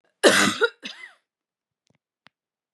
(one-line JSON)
{"cough_length": "2.7 s", "cough_amplitude": 28397, "cough_signal_mean_std_ratio": 0.3, "survey_phase": "beta (2021-08-13 to 2022-03-07)", "age": "18-44", "gender": "Female", "wearing_mask": "No", "symptom_none": true, "smoker_status": "Never smoked", "respiratory_condition_asthma": false, "respiratory_condition_other": false, "recruitment_source": "REACT", "submission_delay": "1 day", "covid_test_result": "Negative", "covid_test_method": "RT-qPCR", "influenza_a_test_result": "Negative", "influenza_b_test_result": "Negative"}